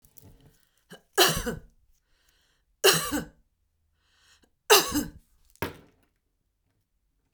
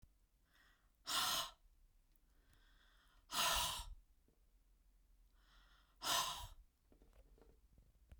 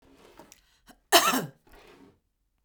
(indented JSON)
{
  "three_cough_length": "7.3 s",
  "three_cough_amplitude": 26626,
  "three_cough_signal_mean_std_ratio": 0.27,
  "exhalation_length": "8.2 s",
  "exhalation_amplitude": 2342,
  "exhalation_signal_mean_std_ratio": 0.38,
  "cough_length": "2.6 s",
  "cough_amplitude": 21405,
  "cough_signal_mean_std_ratio": 0.27,
  "survey_phase": "beta (2021-08-13 to 2022-03-07)",
  "age": "45-64",
  "gender": "Female",
  "wearing_mask": "No",
  "symptom_none": true,
  "smoker_status": "Ex-smoker",
  "respiratory_condition_asthma": false,
  "respiratory_condition_other": false,
  "recruitment_source": "REACT",
  "submission_delay": "2 days",
  "covid_test_result": "Negative",
  "covid_test_method": "RT-qPCR"
}